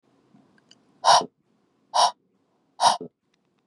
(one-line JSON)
{"exhalation_length": "3.7 s", "exhalation_amplitude": 19691, "exhalation_signal_mean_std_ratio": 0.29, "survey_phase": "beta (2021-08-13 to 2022-03-07)", "age": "18-44", "gender": "Female", "wearing_mask": "No", "symptom_runny_or_blocked_nose": true, "symptom_sore_throat": true, "symptom_diarrhoea": true, "symptom_headache": true, "smoker_status": "Ex-smoker", "respiratory_condition_asthma": false, "respiratory_condition_other": false, "recruitment_source": "REACT", "submission_delay": "1 day", "covid_test_result": "Negative", "covid_test_method": "RT-qPCR", "influenza_a_test_result": "Unknown/Void", "influenza_b_test_result": "Unknown/Void"}